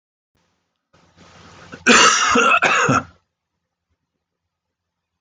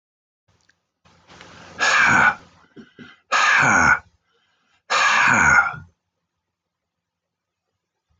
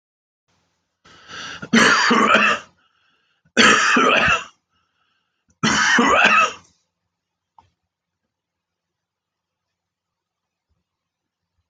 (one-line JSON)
{"cough_length": "5.2 s", "cough_amplitude": 28585, "cough_signal_mean_std_ratio": 0.39, "exhalation_length": "8.2 s", "exhalation_amplitude": 22324, "exhalation_signal_mean_std_ratio": 0.44, "three_cough_length": "11.7 s", "three_cough_amplitude": 28472, "three_cough_signal_mean_std_ratio": 0.4, "survey_phase": "beta (2021-08-13 to 2022-03-07)", "age": "65+", "gender": "Male", "wearing_mask": "No", "symptom_none": true, "smoker_status": "Current smoker (e-cigarettes or vapes only)", "respiratory_condition_asthma": false, "respiratory_condition_other": false, "recruitment_source": "REACT", "submission_delay": "2 days", "covid_test_result": "Negative", "covid_test_method": "RT-qPCR"}